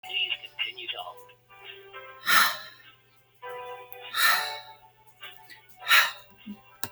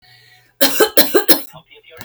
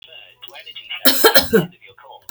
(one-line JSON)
{"exhalation_length": "6.9 s", "exhalation_amplitude": 16480, "exhalation_signal_mean_std_ratio": 0.41, "three_cough_length": "2.0 s", "three_cough_amplitude": 32768, "three_cough_signal_mean_std_ratio": 0.43, "cough_length": "2.3 s", "cough_amplitude": 32768, "cough_signal_mean_std_ratio": 0.41, "survey_phase": "beta (2021-08-13 to 2022-03-07)", "age": "45-64", "gender": "Female", "wearing_mask": "No", "symptom_none": true, "smoker_status": "Never smoked", "respiratory_condition_asthma": false, "respiratory_condition_other": false, "recruitment_source": "REACT", "submission_delay": "0 days", "covid_test_result": "Negative", "covid_test_method": "RT-qPCR", "influenza_a_test_result": "Negative", "influenza_b_test_result": "Negative"}